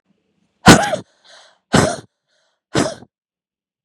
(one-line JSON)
{"exhalation_length": "3.8 s", "exhalation_amplitude": 32768, "exhalation_signal_mean_std_ratio": 0.29, "survey_phase": "beta (2021-08-13 to 2022-03-07)", "age": "45-64", "gender": "Female", "wearing_mask": "No", "symptom_cough_any": true, "symptom_runny_or_blocked_nose": true, "symptom_sore_throat": true, "symptom_fatigue": true, "symptom_headache": true, "symptom_change_to_sense_of_smell_or_taste": true, "symptom_loss_of_taste": true, "symptom_other": true, "smoker_status": "Ex-smoker", "respiratory_condition_asthma": false, "respiratory_condition_other": true, "recruitment_source": "Test and Trace", "submission_delay": "5 days", "covid_test_result": "Positive", "covid_test_method": "RT-qPCR", "covid_ct_value": 28.5, "covid_ct_gene": "ORF1ab gene", "covid_ct_mean": 28.8, "covid_viral_load": "360 copies/ml", "covid_viral_load_category": "Minimal viral load (< 10K copies/ml)"}